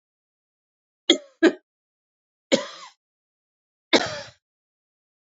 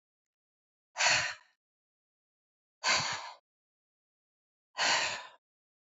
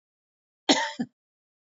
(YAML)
three_cough_length: 5.2 s
three_cough_amplitude: 27987
three_cough_signal_mean_std_ratio: 0.22
exhalation_length: 6.0 s
exhalation_amplitude: 6965
exhalation_signal_mean_std_ratio: 0.35
cough_length: 1.7 s
cough_amplitude: 19717
cough_signal_mean_std_ratio: 0.28
survey_phase: beta (2021-08-13 to 2022-03-07)
age: 45-64
gender: Female
wearing_mask: 'No'
symptom_none: true
smoker_status: Ex-smoker
respiratory_condition_asthma: false
respiratory_condition_other: false
recruitment_source: REACT
submission_delay: 2 days
covid_test_result: Negative
covid_test_method: RT-qPCR
influenza_a_test_result: Unknown/Void
influenza_b_test_result: Unknown/Void